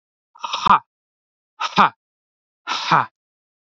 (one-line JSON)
{"exhalation_length": "3.7 s", "exhalation_amplitude": 27547, "exhalation_signal_mean_std_ratio": 0.32, "survey_phase": "beta (2021-08-13 to 2022-03-07)", "age": "18-44", "gender": "Male", "wearing_mask": "No", "symptom_none": true, "smoker_status": "Ex-smoker", "respiratory_condition_asthma": false, "respiratory_condition_other": false, "recruitment_source": "REACT", "submission_delay": "2 days", "covid_test_result": "Negative", "covid_test_method": "RT-qPCR", "influenza_a_test_result": "Negative", "influenza_b_test_result": "Negative"}